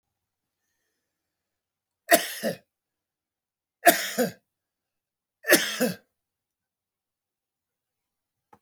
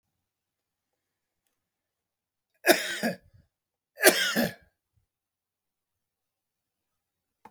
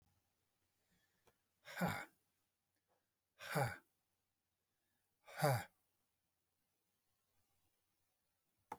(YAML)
three_cough_length: 8.6 s
three_cough_amplitude: 28585
three_cough_signal_mean_std_ratio: 0.23
cough_length: 7.5 s
cough_amplitude: 23956
cough_signal_mean_std_ratio: 0.23
exhalation_length: 8.8 s
exhalation_amplitude: 2703
exhalation_signal_mean_std_ratio: 0.24
survey_phase: alpha (2021-03-01 to 2021-08-12)
age: 65+
gender: Male
wearing_mask: 'No'
symptom_none: true
smoker_status: Ex-smoker
respiratory_condition_asthma: false
respiratory_condition_other: true
recruitment_source: REACT
submission_delay: 4 days
covid_test_result: Negative
covid_test_method: RT-qPCR